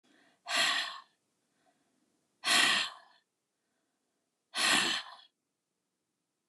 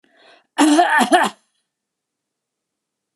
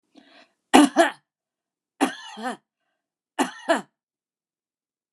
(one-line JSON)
{"exhalation_length": "6.5 s", "exhalation_amplitude": 7795, "exhalation_signal_mean_std_ratio": 0.37, "cough_length": "3.2 s", "cough_amplitude": 32311, "cough_signal_mean_std_ratio": 0.39, "three_cough_length": "5.1 s", "three_cough_amplitude": 32767, "three_cough_signal_mean_std_ratio": 0.26, "survey_phase": "beta (2021-08-13 to 2022-03-07)", "age": "65+", "gender": "Female", "wearing_mask": "No", "symptom_none": true, "smoker_status": "Never smoked", "respiratory_condition_asthma": false, "respiratory_condition_other": false, "recruitment_source": "REACT", "submission_delay": "1 day", "covid_test_result": "Negative", "covid_test_method": "RT-qPCR", "influenza_a_test_result": "Negative", "influenza_b_test_result": "Negative"}